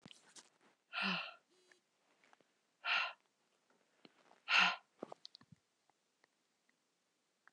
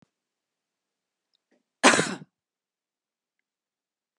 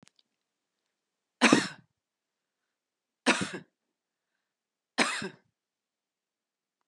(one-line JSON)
{"exhalation_length": "7.5 s", "exhalation_amplitude": 4126, "exhalation_signal_mean_std_ratio": 0.27, "cough_length": "4.2 s", "cough_amplitude": 24734, "cough_signal_mean_std_ratio": 0.18, "three_cough_length": "6.9 s", "three_cough_amplitude": 19586, "three_cough_signal_mean_std_ratio": 0.22, "survey_phase": "beta (2021-08-13 to 2022-03-07)", "age": "45-64", "gender": "Female", "wearing_mask": "No", "symptom_none": true, "smoker_status": "Never smoked", "respiratory_condition_asthma": false, "respiratory_condition_other": false, "recruitment_source": "REACT", "submission_delay": "2 days", "covid_test_result": "Negative", "covid_test_method": "RT-qPCR", "influenza_a_test_result": "Negative", "influenza_b_test_result": "Negative"}